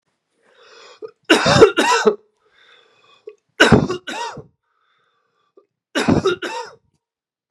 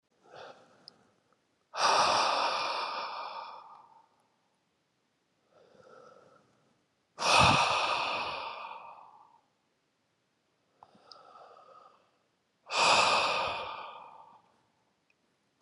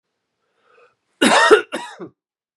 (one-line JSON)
{"three_cough_length": "7.5 s", "three_cough_amplitude": 32768, "three_cough_signal_mean_std_ratio": 0.36, "exhalation_length": "15.6 s", "exhalation_amplitude": 11771, "exhalation_signal_mean_std_ratio": 0.41, "cough_length": "2.6 s", "cough_amplitude": 32767, "cough_signal_mean_std_ratio": 0.34, "survey_phase": "beta (2021-08-13 to 2022-03-07)", "age": "18-44", "gender": "Male", "wearing_mask": "No", "symptom_cough_any": true, "symptom_runny_or_blocked_nose": true, "symptom_shortness_of_breath": true, "symptom_abdominal_pain": true, "symptom_fatigue": true, "symptom_headache": true, "symptom_change_to_sense_of_smell_or_taste": true, "symptom_onset": "5 days", "smoker_status": "Never smoked", "respiratory_condition_asthma": false, "respiratory_condition_other": false, "recruitment_source": "Test and Trace", "submission_delay": "1 day", "covid_test_result": "Positive", "covid_test_method": "RT-qPCR", "covid_ct_value": 15.8, "covid_ct_gene": "N gene", "covid_ct_mean": 17.4, "covid_viral_load": "2000000 copies/ml", "covid_viral_load_category": "High viral load (>1M copies/ml)"}